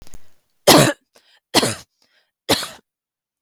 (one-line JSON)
{"three_cough_length": "3.4 s", "three_cough_amplitude": 32768, "three_cough_signal_mean_std_ratio": 0.32, "survey_phase": "beta (2021-08-13 to 2022-03-07)", "age": "18-44", "gender": "Female", "wearing_mask": "No", "symptom_sore_throat": true, "symptom_fatigue": true, "symptom_headache": true, "symptom_onset": "1 day", "smoker_status": "Never smoked", "respiratory_condition_asthma": false, "respiratory_condition_other": false, "recruitment_source": "Test and Trace", "submission_delay": "1 day", "covid_test_result": "Positive", "covid_test_method": "RT-qPCR", "covid_ct_value": 20.7, "covid_ct_gene": "ORF1ab gene"}